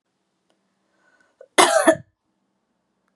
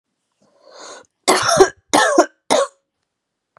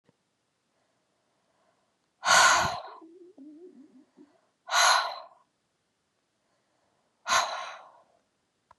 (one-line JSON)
{"cough_length": "3.2 s", "cough_amplitude": 32724, "cough_signal_mean_std_ratio": 0.25, "three_cough_length": "3.6 s", "three_cough_amplitude": 32767, "three_cough_signal_mean_std_ratio": 0.4, "exhalation_length": "8.8 s", "exhalation_amplitude": 14737, "exhalation_signal_mean_std_ratio": 0.31, "survey_phase": "beta (2021-08-13 to 2022-03-07)", "age": "18-44", "gender": "Female", "wearing_mask": "No", "symptom_runny_or_blocked_nose": true, "symptom_sore_throat": true, "symptom_fatigue": true, "symptom_fever_high_temperature": true, "symptom_headache": true, "smoker_status": "Never smoked", "respiratory_condition_asthma": false, "respiratory_condition_other": false, "recruitment_source": "Test and Trace", "submission_delay": "2 days", "covid_test_result": "Positive", "covid_test_method": "RT-qPCR", "covid_ct_value": 20.8, "covid_ct_gene": "ORF1ab gene", "covid_ct_mean": 21.0, "covid_viral_load": "130000 copies/ml", "covid_viral_load_category": "Low viral load (10K-1M copies/ml)"}